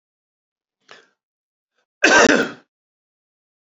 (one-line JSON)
{"cough_length": "3.8 s", "cough_amplitude": 28948, "cough_signal_mean_std_ratio": 0.26, "survey_phase": "beta (2021-08-13 to 2022-03-07)", "age": "45-64", "gender": "Male", "wearing_mask": "Yes", "symptom_none": true, "smoker_status": "Ex-smoker", "respiratory_condition_asthma": false, "respiratory_condition_other": false, "recruitment_source": "REACT", "submission_delay": "2 days", "covid_test_result": "Negative", "covid_test_method": "RT-qPCR", "influenza_a_test_result": "Negative", "influenza_b_test_result": "Negative"}